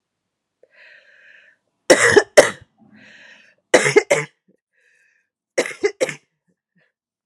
{
  "three_cough_length": "7.3 s",
  "three_cough_amplitude": 32768,
  "three_cough_signal_mean_std_ratio": 0.27,
  "survey_phase": "beta (2021-08-13 to 2022-03-07)",
  "age": "45-64",
  "gender": "Female",
  "wearing_mask": "No",
  "symptom_runny_or_blocked_nose": true,
  "symptom_onset": "3 days",
  "smoker_status": "Never smoked",
  "respiratory_condition_asthma": false,
  "respiratory_condition_other": false,
  "recruitment_source": "Test and Trace",
  "submission_delay": "2 days",
  "covid_test_result": "Positive",
  "covid_test_method": "ePCR"
}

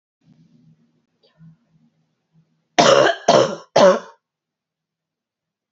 {
  "cough_length": "5.7 s",
  "cough_amplitude": 32767,
  "cough_signal_mean_std_ratio": 0.31,
  "survey_phase": "beta (2021-08-13 to 2022-03-07)",
  "age": "45-64",
  "gender": "Female",
  "wearing_mask": "No",
  "symptom_new_continuous_cough": true,
  "symptom_runny_or_blocked_nose": true,
  "symptom_sore_throat": true,
  "symptom_fatigue": true,
  "symptom_headache": true,
  "symptom_change_to_sense_of_smell_or_taste": true,
  "symptom_onset": "3 days",
  "smoker_status": "Never smoked",
  "respiratory_condition_asthma": false,
  "respiratory_condition_other": false,
  "recruitment_source": "Test and Trace",
  "submission_delay": "2 days",
  "covid_test_result": "Positive",
  "covid_test_method": "RT-qPCR",
  "covid_ct_value": 27.8,
  "covid_ct_gene": "ORF1ab gene",
  "covid_ct_mean": 28.4,
  "covid_viral_load": "470 copies/ml",
  "covid_viral_load_category": "Minimal viral load (< 10K copies/ml)"
}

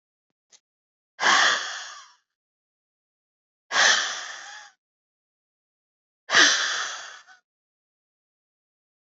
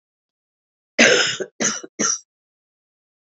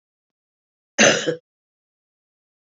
{
  "exhalation_length": "9.0 s",
  "exhalation_amplitude": 23365,
  "exhalation_signal_mean_std_ratio": 0.33,
  "three_cough_length": "3.2 s",
  "three_cough_amplitude": 32244,
  "three_cough_signal_mean_std_ratio": 0.36,
  "cough_length": "2.7 s",
  "cough_amplitude": 29850,
  "cough_signal_mean_std_ratio": 0.25,
  "survey_phase": "beta (2021-08-13 to 2022-03-07)",
  "age": "45-64",
  "gender": "Female",
  "wearing_mask": "No",
  "symptom_cough_any": true,
  "symptom_runny_or_blocked_nose": true,
  "symptom_sore_throat": true,
  "symptom_fatigue": true,
  "symptom_headache": true,
  "symptom_onset": "3 days",
  "smoker_status": "Ex-smoker",
  "respiratory_condition_asthma": false,
  "respiratory_condition_other": false,
  "recruitment_source": "Test and Trace",
  "submission_delay": "2 days",
  "covid_test_result": "Positive",
  "covid_test_method": "RT-qPCR"
}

